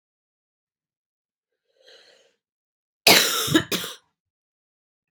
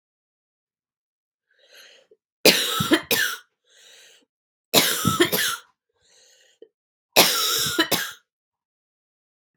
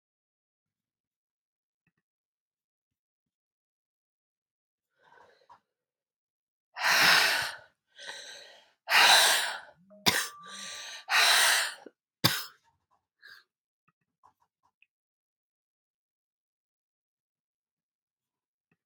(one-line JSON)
{"cough_length": "5.1 s", "cough_amplitude": 32767, "cough_signal_mean_std_ratio": 0.25, "three_cough_length": "9.6 s", "three_cough_amplitude": 32767, "three_cough_signal_mean_std_ratio": 0.37, "exhalation_length": "18.9 s", "exhalation_amplitude": 15124, "exhalation_signal_mean_std_ratio": 0.28, "survey_phase": "beta (2021-08-13 to 2022-03-07)", "age": "45-64", "gender": "Female", "wearing_mask": "No", "symptom_cough_any": true, "symptom_new_continuous_cough": true, "symptom_runny_or_blocked_nose": true, "symptom_sore_throat": true, "symptom_fatigue": true, "symptom_onset": "4 days", "smoker_status": "Never smoked", "respiratory_condition_asthma": false, "respiratory_condition_other": false, "recruitment_source": "REACT", "submission_delay": "1 day", "covid_test_result": "Negative", "covid_test_method": "RT-qPCR"}